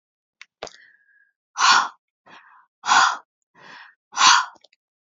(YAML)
exhalation_length: 5.1 s
exhalation_amplitude: 29037
exhalation_signal_mean_std_ratio: 0.33
survey_phase: alpha (2021-03-01 to 2021-08-12)
age: 45-64
gender: Female
wearing_mask: 'No'
symptom_none: true
smoker_status: Current smoker (1 to 10 cigarettes per day)
respiratory_condition_asthma: true
respiratory_condition_other: false
recruitment_source: REACT
submission_delay: 2 days
covid_test_result: Negative
covid_test_method: RT-qPCR